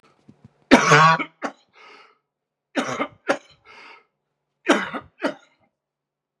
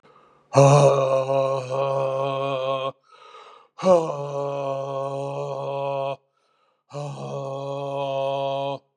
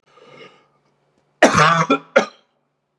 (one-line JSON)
{"three_cough_length": "6.4 s", "three_cough_amplitude": 32767, "three_cough_signal_mean_std_ratio": 0.31, "exhalation_length": "9.0 s", "exhalation_amplitude": 27122, "exhalation_signal_mean_std_ratio": 0.65, "cough_length": "3.0 s", "cough_amplitude": 32767, "cough_signal_mean_std_ratio": 0.35, "survey_phase": "beta (2021-08-13 to 2022-03-07)", "age": "65+", "gender": "Male", "wearing_mask": "No", "symptom_cough_any": true, "symptom_runny_or_blocked_nose": true, "symptom_shortness_of_breath": true, "symptom_fatigue": true, "symptom_onset": "12 days", "smoker_status": "Never smoked", "respiratory_condition_asthma": true, "respiratory_condition_other": false, "recruitment_source": "REACT", "submission_delay": "1 day", "covid_test_result": "Negative", "covid_test_method": "RT-qPCR", "influenza_a_test_result": "Negative", "influenza_b_test_result": "Negative"}